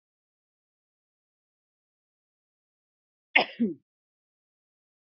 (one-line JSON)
{"cough_length": "5.0 s", "cough_amplitude": 22373, "cough_signal_mean_std_ratio": 0.15, "survey_phase": "beta (2021-08-13 to 2022-03-07)", "age": "65+", "gender": "Female", "wearing_mask": "No", "symptom_cough_any": true, "symptom_runny_or_blocked_nose": true, "symptom_sore_throat": true, "symptom_fatigue": true, "symptom_onset": "3 days", "smoker_status": "Ex-smoker", "respiratory_condition_asthma": false, "respiratory_condition_other": false, "recruitment_source": "Test and Trace", "submission_delay": "1 day", "covid_test_result": "Positive", "covid_test_method": "RT-qPCR", "covid_ct_value": 21.4, "covid_ct_gene": "ORF1ab gene"}